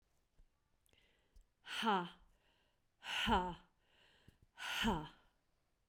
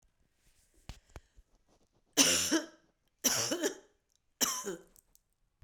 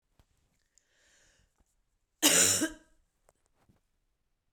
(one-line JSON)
{"exhalation_length": "5.9 s", "exhalation_amplitude": 2423, "exhalation_signal_mean_std_ratio": 0.39, "three_cough_length": "5.6 s", "three_cough_amplitude": 12600, "three_cough_signal_mean_std_ratio": 0.36, "cough_length": "4.5 s", "cough_amplitude": 15881, "cough_signal_mean_std_ratio": 0.25, "survey_phase": "beta (2021-08-13 to 2022-03-07)", "age": "65+", "gender": "Female", "wearing_mask": "No", "symptom_cough_any": true, "symptom_runny_or_blocked_nose": true, "symptom_shortness_of_breath": true, "symptom_headache": true, "symptom_change_to_sense_of_smell_or_taste": true, "symptom_onset": "5 days", "smoker_status": "Ex-smoker", "respiratory_condition_asthma": false, "respiratory_condition_other": false, "recruitment_source": "Test and Trace", "submission_delay": "2 days", "covid_test_result": "Positive", "covid_test_method": "RT-qPCR", "covid_ct_value": 20.5, "covid_ct_gene": "ORF1ab gene", "covid_ct_mean": 21.1, "covid_viral_load": "120000 copies/ml", "covid_viral_load_category": "Low viral load (10K-1M copies/ml)"}